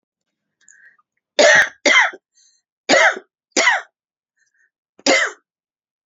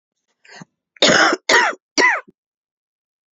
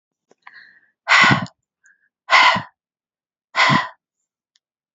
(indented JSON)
{
  "three_cough_length": "6.1 s",
  "three_cough_amplitude": 29777,
  "three_cough_signal_mean_std_ratio": 0.37,
  "cough_length": "3.3 s",
  "cough_amplitude": 30237,
  "cough_signal_mean_std_ratio": 0.41,
  "exhalation_length": "4.9 s",
  "exhalation_amplitude": 29703,
  "exhalation_signal_mean_std_ratio": 0.35,
  "survey_phase": "beta (2021-08-13 to 2022-03-07)",
  "age": "45-64",
  "gender": "Female",
  "wearing_mask": "No",
  "symptom_cough_any": true,
  "symptom_new_continuous_cough": true,
  "symptom_runny_or_blocked_nose": true,
  "symptom_sore_throat": true,
  "symptom_onset": "4 days",
  "smoker_status": "Never smoked",
  "respiratory_condition_asthma": false,
  "respiratory_condition_other": false,
  "recruitment_source": "Test and Trace",
  "submission_delay": "2 days",
  "covid_test_result": "Positive",
  "covid_test_method": "RT-qPCR"
}